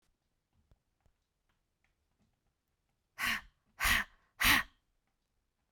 {
  "exhalation_length": "5.7 s",
  "exhalation_amplitude": 6719,
  "exhalation_signal_mean_std_ratio": 0.26,
  "survey_phase": "beta (2021-08-13 to 2022-03-07)",
  "age": "18-44",
  "gender": "Female",
  "wearing_mask": "No",
  "symptom_fatigue": true,
  "smoker_status": "Never smoked",
  "respiratory_condition_asthma": true,
  "respiratory_condition_other": false,
  "recruitment_source": "REACT",
  "submission_delay": "1 day",
  "covid_test_result": "Negative",
  "covid_test_method": "RT-qPCR"
}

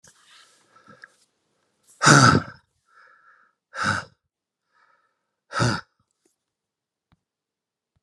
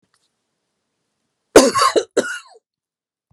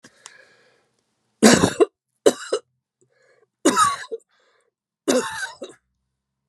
{
  "exhalation_length": "8.0 s",
  "exhalation_amplitude": 31508,
  "exhalation_signal_mean_std_ratio": 0.24,
  "cough_length": "3.3 s",
  "cough_amplitude": 32768,
  "cough_signal_mean_std_ratio": 0.29,
  "three_cough_length": "6.5 s",
  "three_cough_amplitude": 32567,
  "three_cough_signal_mean_std_ratio": 0.31,
  "survey_phase": "beta (2021-08-13 to 2022-03-07)",
  "age": "18-44",
  "gender": "Male",
  "wearing_mask": "No",
  "symptom_none": true,
  "smoker_status": "Ex-smoker",
  "respiratory_condition_asthma": false,
  "respiratory_condition_other": false,
  "recruitment_source": "REACT",
  "submission_delay": "1 day",
  "covid_test_result": "Negative",
  "covid_test_method": "RT-qPCR",
  "influenza_a_test_result": "Negative",
  "influenza_b_test_result": "Negative"
}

